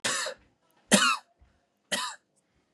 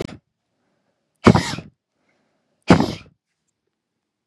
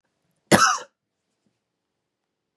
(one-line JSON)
{"three_cough_length": "2.7 s", "three_cough_amplitude": 22622, "three_cough_signal_mean_std_ratio": 0.37, "exhalation_length": "4.3 s", "exhalation_amplitude": 32768, "exhalation_signal_mean_std_ratio": 0.22, "cough_length": "2.6 s", "cough_amplitude": 32767, "cough_signal_mean_std_ratio": 0.24, "survey_phase": "beta (2021-08-13 to 2022-03-07)", "age": "18-44", "gender": "Male", "wearing_mask": "No", "symptom_none": true, "smoker_status": "Never smoked", "respiratory_condition_asthma": false, "respiratory_condition_other": false, "recruitment_source": "REACT", "submission_delay": "1 day", "covid_test_result": "Negative", "covid_test_method": "RT-qPCR", "influenza_a_test_result": "Negative", "influenza_b_test_result": "Negative"}